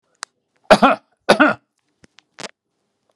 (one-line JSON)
{"cough_length": "3.2 s", "cough_amplitude": 32768, "cough_signal_mean_std_ratio": 0.28, "survey_phase": "beta (2021-08-13 to 2022-03-07)", "age": "65+", "gender": "Male", "wearing_mask": "No", "symptom_none": true, "smoker_status": "Ex-smoker", "respiratory_condition_asthma": false, "respiratory_condition_other": false, "recruitment_source": "REACT", "submission_delay": "9 days", "covid_test_result": "Negative", "covid_test_method": "RT-qPCR", "influenza_a_test_result": "Unknown/Void", "influenza_b_test_result": "Unknown/Void"}